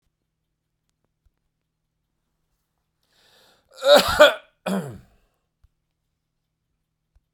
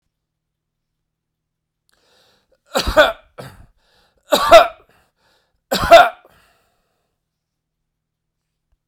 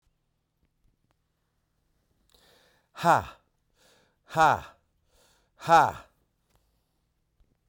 cough_length: 7.3 s
cough_amplitude: 32767
cough_signal_mean_std_ratio: 0.21
three_cough_length: 8.9 s
three_cough_amplitude: 32768
three_cough_signal_mean_std_ratio: 0.23
exhalation_length: 7.7 s
exhalation_amplitude: 16052
exhalation_signal_mean_std_ratio: 0.22
survey_phase: beta (2021-08-13 to 2022-03-07)
age: 65+
gender: Male
wearing_mask: 'No'
symptom_none: true
smoker_status: Ex-smoker
respiratory_condition_asthma: false
respiratory_condition_other: false
recruitment_source: Test and Trace
submission_delay: 3 days
covid_test_result: Positive
covid_test_method: RT-qPCR
covid_ct_value: 13.8
covid_ct_gene: ORF1ab gene
covid_ct_mean: 14.0
covid_viral_load: 25000000 copies/ml
covid_viral_load_category: High viral load (>1M copies/ml)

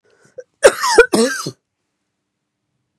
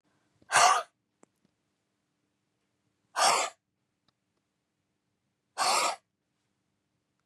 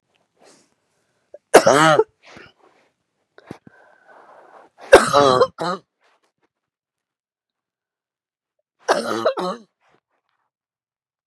cough_length: 3.0 s
cough_amplitude: 32768
cough_signal_mean_std_ratio: 0.32
exhalation_length: 7.3 s
exhalation_amplitude: 12081
exhalation_signal_mean_std_ratio: 0.28
three_cough_length: 11.3 s
three_cough_amplitude: 32768
three_cough_signal_mean_std_ratio: 0.26
survey_phase: beta (2021-08-13 to 2022-03-07)
age: 45-64
gender: Female
wearing_mask: 'No'
symptom_cough_any: true
symptom_onset: 12 days
smoker_status: Never smoked
respiratory_condition_asthma: true
respiratory_condition_other: false
recruitment_source: REACT
submission_delay: 2 days
covid_test_result: Negative
covid_test_method: RT-qPCR
influenza_a_test_result: Negative
influenza_b_test_result: Negative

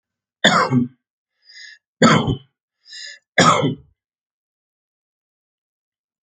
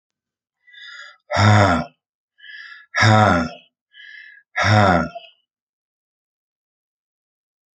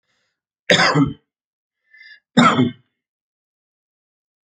three_cough_length: 6.2 s
three_cough_amplitude: 29154
three_cough_signal_mean_std_ratio: 0.34
exhalation_length: 7.8 s
exhalation_amplitude: 28392
exhalation_signal_mean_std_ratio: 0.38
cough_length: 4.4 s
cough_amplitude: 32768
cough_signal_mean_std_ratio: 0.32
survey_phase: alpha (2021-03-01 to 2021-08-12)
age: 65+
gender: Male
wearing_mask: 'No'
symptom_none: true
symptom_shortness_of_breath: true
smoker_status: Ex-smoker
respiratory_condition_asthma: false
respiratory_condition_other: false
recruitment_source: REACT
submission_delay: 2 days
covid_test_result: Negative
covid_test_method: RT-qPCR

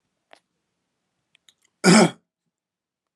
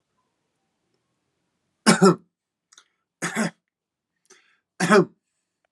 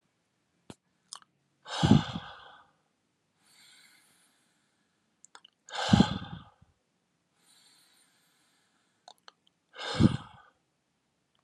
cough_length: 3.2 s
cough_amplitude: 28301
cough_signal_mean_std_ratio: 0.23
three_cough_length: 5.7 s
three_cough_amplitude: 28711
three_cough_signal_mean_std_ratio: 0.25
exhalation_length: 11.4 s
exhalation_amplitude: 16057
exhalation_signal_mean_std_ratio: 0.21
survey_phase: beta (2021-08-13 to 2022-03-07)
age: 18-44
gender: Male
wearing_mask: 'No'
symptom_cough_any: true
symptom_runny_or_blocked_nose: true
symptom_onset: 5 days
smoker_status: Ex-smoker
respiratory_condition_asthma: false
respiratory_condition_other: false
recruitment_source: Test and Trace
submission_delay: 3 days
covid_test_method: RT-qPCR
covid_ct_value: 19.4
covid_ct_gene: ORF1ab gene
covid_ct_mean: 20.5
covid_viral_load: 190000 copies/ml
covid_viral_load_category: Low viral load (10K-1M copies/ml)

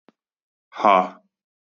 exhalation_length: 1.8 s
exhalation_amplitude: 27695
exhalation_signal_mean_std_ratio: 0.27
survey_phase: beta (2021-08-13 to 2022-03-07)
age: 18-44
gender: Male
wearing_mask: 'No'
symptom_cough_any: true
symptom_sore_throat: true
smoker_status: Never smoked
respiratory_condition_asthma: true
respiratory_condition_other: false
recruitment_source: REACT
submission_delay: 1 day
covid_test_result: Negative
covid_test_method: RT-qPCR
influenza_a_test_result: Negative
influenza_b_test_result: Negative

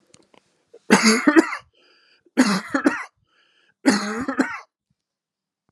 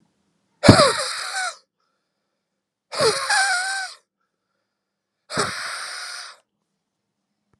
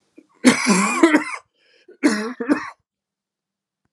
three_cough_length: 5.7 s
three_cough_amplitude: 30464
three_cough_signal_mean_std_ratio: 0.39
exhalation_length: 7.6 s
exhalation_amplitude: 32768
exhalation_signal_mean_std_ratio: 0.36
cough_length: 3.9 s
cough_amplitude: 31926
cough_signal_mean_std_ratio: 0.43
survey_phase: alpha (2021-03-01 to 2021-08-12)
age: 45-64
gender: Male
wearing_mask: 'No'
symptom_shortness_of_breath: true
symptom_change_to_sense_of_smell_or_taste: true
symptom_onset: 4 days
smoker_status: Never smoked
respiratory_condition_asthma: false
respiratory_condition_other: false
recruitment_source: Test and Trace
submission_delay: 2 days
covid_test_result: Positive
covid_test_method: RT-qPCR
covid_ct_value: 17.7
covid_ct_gene: N gene
covid_ct_mean: 17.8
covid_viral_load: 1500000 copies/ml
covid_viral_load_category: High viral load (>1M copies/ml)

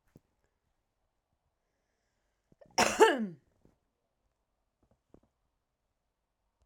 cough_length: 6.7 s
cough_amplitude: 11367
cough_signal_mean_std_ratio: 0.18
survey_phase: alpha (2021-03-01 to 2021-08-12)
age: 45-64
gender: Female
wearing_mask: 'No'
symptom_none: true
smoker_status: Never smoked
respiratory_condition_asthma: false
respiratory_condition_other: false
recruitment_source: REACT
submission_delay: 2 days
covid_test_result: Negative
covid_test_method: RT-qPCR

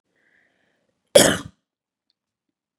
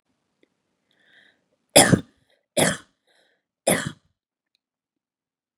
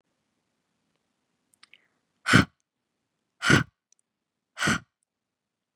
cough_length: 2.8 s
cough_amplitude: 32768
cough_signal_mean_std_ratio: 0.19
three_cough_length: 5.6 s
three_cough_amplitude: 32662
three_cough_signal_mean_std_ratio: 0.22
exhalation_length: 5.8 s
exhalation_amplitude: 26092
exhalation_signal_mean_std_ratio: 0.21
survey_phase: beta (2021-08-13 to 2022-03-07)
age: 18-44
gender: Female
wearing_mask: 'No'
symptom_none: true
smoker_status: Never smoked
respiratory_condition_asthma: false
respiratory_condition_other: false
recruitment_source: REACT
submission_delay: 1 day
covid_test_result: Negative
covid_test_method: RT-qPCR
influenza_a_test_result: Negative
influenza_b_test_result: Negative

